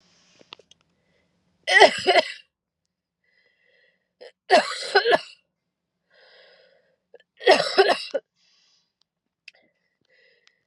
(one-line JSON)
{"three_cough_length": "10.7 s", "three_cough_amplitude": 32768, "three_cough_signal_mean_std_ratio": 0.28, "survey_phase": "beta (2021-08-13 to 2022-03-07)", "age": "18-44", "gender": "Female", "wearing_mask": "No", "symptom_cough_any": true, "symptom_new_continuous_cough": true, "symptom_runny_or_blocked_nose": true, "symptom_shortness_of_breath": true, "symptom_diarrhoea": true, "symptom_fatigue": true, "symptom_fever_high_temperature": true, "symptom_headache": true, "symptom_change_to_sense_of_smell_or_taste": true, "symptom_other": true, "symptom_onset": "3 days", "smoker_status": "Never smoked", "respiratory_condition_asthma": true, "respiratory_condition_other": false, "recruitment_source": "Test and Trace", "submission_delay": "1 day", "covid_test_result": "Positive", "covid_test_method": "ePCR"}